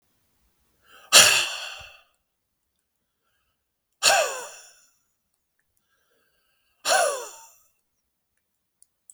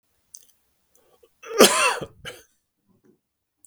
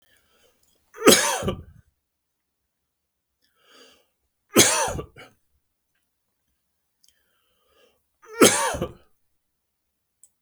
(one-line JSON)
{"exhalation_length": "9.1 s", "exhalation_amplitude": 32768, "exhalation_signal_mean_std_ratio": 0.26, "cough_length": "3.7 s", "cough_amplitude": 32768, "cough_signal_mean_std_ratio": 0.26, "three_cough_length": "10.4 s", "three_cough_amplitude": 32768, "three_cough_signal_mean_std_ratio": 0.25, "survey_phase": "beta (2021-08-13 to 2022-03-07)", "age": "65+", "gender": "Male", "wearing_mask": "No", "symptom_none": true, "smoker_status": "Never smoked", "respiratory_condition_asthma": false, "respiratory_condition_other": false, "recruitment_source": "Test and Trace", "submission_delay": "1 day", "covid_test_result": "Negative", "covid_test_method": "RT-qPCR"}